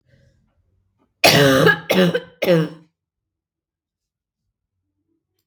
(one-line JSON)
{"three_cough_length": "5.5 s", "three_cough_amplitude": 32767, "three_cough_signal_mean_std_ratio": 0.36, "survey_phase": "beta (2021-08-13 to 2022-03-07)", "age": "18-44", "gender": "Female", "wearing_mask": "No", "symptom_cough_any": true, "symptom_runny_or_blocked_nose": true, "symptom_sore_throat": true, "smoker_status": "Never smoked", "respiratory_condition_asthma": false, "respiratory_condition_other": false, "recruitment_source": "Test and Trace", "submission_delay": "1 day", "covid_test_result": "Positive", "covid_test_method": "LFT"}